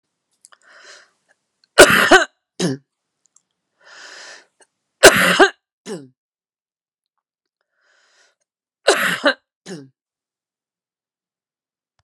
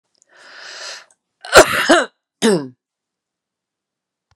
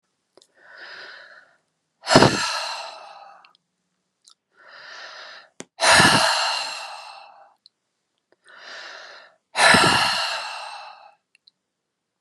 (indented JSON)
{
  "three_cough_length": "12.0 s",
  "three_cough_amplitude": 32768,
  "three_cough_signal_mean_std_ratio": 0.25,
  "cough_length": "4.4 s",
  "cough_amplitude": 32768,
  "cough_signal_mean_std_ratio": 0.3,
  "exhalation_length": "12.2 s",
  "exhalation_amplitude": 32767,
  "exhalation_signal_mean_std_ratio": 0.37,
  "survey_phase": "beta (2021-08-13 to 2022-03-07)",
  "age": "65+",
  "gender": "Female",
  "wearing_mask": "No",
  "symptom_none": true,
  "smoker_status": "Never smoked",
  "respiratory_condition_asthma": false,
  "respiratory_condition_other": false,
  "recruitment_source": "Test and Trace",
  "submission_delay": "1 day",
  "covid_test_result": "Positive",
  "covid_test_method": "RT-qPCR"
}